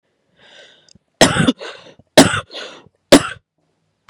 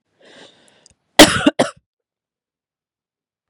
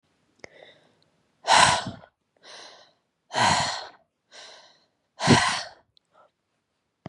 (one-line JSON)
{"three_cough_length": "4.1 s", "three_cough_amplitude": 32768, "three_cough_signal_mean_std_ratio": 0.3, "cough_length": "3.5 s", "cough_amplitude": 32768, "cough_signal_mean_std_ratio": 0.21, "exhalation_length": "7.1 s", "exhalation_amplitude": 23776, "exhalation_signal_mean_std_ratio": 0.33, "survey_phase": "beta (2021-08-13 to 2022-03-07)", "age": "18-44", "gender": "Female", "wearing_mask": "No", "symptom_runny_or_blocked_nose": true, "symptom_sore_throat": true, "symptom_headache": true, "symptom_other": true, "symptom_onset": "7 days", "smoker_status": "Never smoked", "respiratory_condition_asthma": false, "respiratory_condition_other": false, "recruitment_source": "Test and Trace", "submission_delay": "3 days", "covid_test_result": "Positive", "covid_test_method": "RT-qPCR", "covid_ct_value": 26.6, "covid_ct_gene": "ORF1ab gene"}